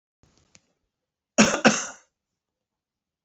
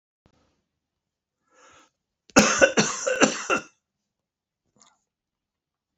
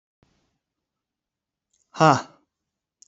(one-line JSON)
{"cough_length": "3.2 s", "cough_amplitude": 26948, "cough_signal_mean_std_ratio": 0.24, "three_cough_length": "6.0 s", "three_cough_amplitude": 28543, "three_cough_signal_mean_std_ratio": 0.28, "exhalation_length": "3.1 s", "exhalation_amplitude": 26204, "exhalation_signal_mean_std_ratio": 0.18, "survey_phase": "beta (2021-08-13 to 2022-03-07)", "age": "65+", "gender": "Male", "wearing_mask": "No", "symptom_cough_any": true, "symptom_sore_throat": true, "symptom_abdominal_pain": true, "symptom_fatigue": true, "symptom_headache": true, "symptom_onset": "4 days", "smoker_status": "Ex-smoker", "respiratory_condition_asthma": false, "respiratory_condition_other": false, "recruitment_source": "Test and Trace", "submission_delay": "1 day", "covid_test_result": "Positive", "covid_test_method": "RT-qPCR", "covid_ct_value": 17.2, "covid_ct_gene": "ORF1ab gene", "covid_ct_mean": 17.5, "covid_viral_load": "1800000 copies/ml", "covid_viral_load_category": "High viral load (>1M copies/ml)"}